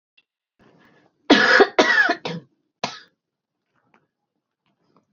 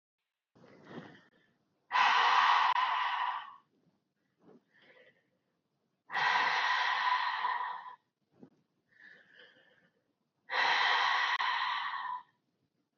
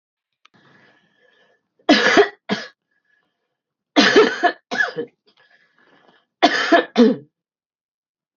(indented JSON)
{
  "cough_length": "5.1 s",
  "cough_amplitude": 29005,
  "cough_signal_mean_std_ratio": 0.32,
  "exhalation_length": "13.0 s",
  "exhalation_amplitude": 6361,
  "exhalation_signal_mean_std_ratio": 0.53,
  "three_cough_length": "8.4 s",
  "three_cough_amplitude": 28681,
  "three_cough_signal_mean_std_ratio": 0.35,
  "survey_phase": "beta (2021-08-13 to 2022-03-07)",
  "age": "45-64",
  "gender": "Female",
  "wearing_mask": "Yes",
  "symptom_new_continuous_cough": true,
  "symptom_runny_or_blocked_nose": true,
  "symptom_sore_throat": true,
  "symptom_fever_high_temperature": true,
  "symptom_headache": true,
  "symptom_onset": "3 days",
  "smoker_status": "Ex-smoker",
  "respiratory_condition_asthma": false,
  "respiratory_condition_other": false,
  "recruitment_source": "Test and Trace",
  "submission_delay": "2 days",
  "covid_test_result": "Positive",
  "covid_test_method": "RT-qPCR",
  "covid_ct_value": 20.2,
  "covid_ct_gene": "ORF1ab gene"
}